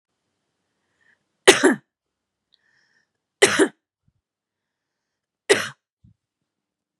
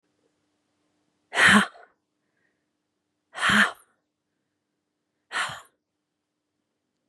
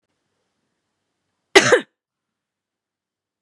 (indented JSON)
{
  "three_cough_length": "7.0 s",
  "three_cough_amplitude": 32768,
  "three_cough_signal_mean_std_ratio": 0.21,
  "exhalation_length": "7.1 s",
  "exhalation_amplitude": 21009,
  "exhalation_signal_mean_std_ratio": 0.25,
  "cough_length": "3.4 s",
  "cough_amplitude": 32768,
  "cough_signal_mean_std_ratio": 0.18,
  "survey_phase": "beta (2021-08-13 to 2022-03-07)",
  "age": "18-44",
  "gender": "Female",
  "wearing_mask": "No",
  "symptom_none": true,
  "smoker_status": "Never smoked",
  "respiratory_condition_asthma": false,
  "respiratory_condition_other": false,
  "recruitment_source": "REACT",
  "submission_delay": "2 days",
  "covid_test_result": "Negative",
  "covid_test_method": "RT-qPCR",
  "influenza_a_test_result": "Negative",
  "influenza_b_test_result": "Negative"
}